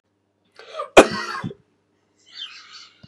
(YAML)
cough_length: 3.1 s
cough_amplitude: 32768
cough_signal_mean_std_ratio: 0.22
survey_phase: beta (2021-08-13 to 2022-03-07)
age: 45-64
gender: Male
wearing_mask: 'No'
symptom_none: true
smoker_status: Never smoked
respiratory_condition_asthma: false
respiratory_condition_other: false
recruitment_source: REACT
submission_delay: 10 days
covid_test_result: Negative
covid_test_method: RT-qPCR
influenza_a_test_result: Unknown/Void
influenza_b_test_result: Unknown/Void